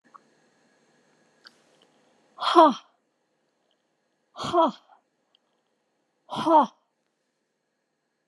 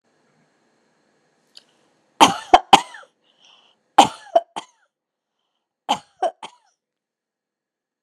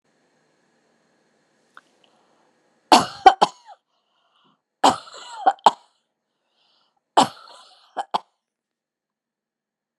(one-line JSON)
{"exhalation_length": "8.3 s", "exhalation_amplitude": 23963, "exhalation_signal_mean_std_ratio": 0.24, "cough_length": "8.0 s", "cough_amplitude": 32768, "cough_signal_mean_std_ratio": 0.19, "three_cough_length": "10.0 s", "three_cough_amplitude": 32768, "three_cough_signal_mean_std_ratio": 0.19, "survey_phase": "alpha (2021-03-01 to 2021-08-12)", "age": "65+", "gender": "Female", "wearing_mask": "No", "symptom_none": true, "smoker_status": "Never smoked", "respiratory_condition_asthma": false, "respiratory_condition_other": false, "recruitment_source": "REACT", "submission_delay": "1 day", "covid_test_result": "Negative", "covid_test_method": "RT-qPCR"}